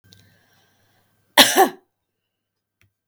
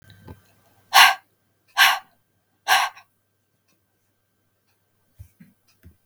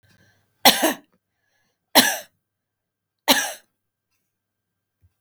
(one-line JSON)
{"cough_length": "3.1 s", "cough_amplitude": 32768, "cough_signal_mean_std_ratio": 0.23, "exhalation_length": "6.1 s", "exhalation_amplitude": 32768, "exhalation_signal_mean_std_ratio": 0.24, "three_cough_length": "5.2 s", "three_cough_amplitude": 32768, "three_cough_signal_mean_std_ratio": 0.25, "survey_phase": "beta (2021-08-13 to 2022-03-07)", "age": "45-64", "gender": "Female", "wearing_mask": "No", "symptom_none": true, "symptom_onset": "12 days", "smoker_status": "Ex-smoker", "respiratory_condition_asthma": true, "respiratory_condition_other": false, "recruitment_source": "REACT", "submission_delay": "2 days", "covid_test_result": "Negative", "covid_test_method": "RT-qPCR"}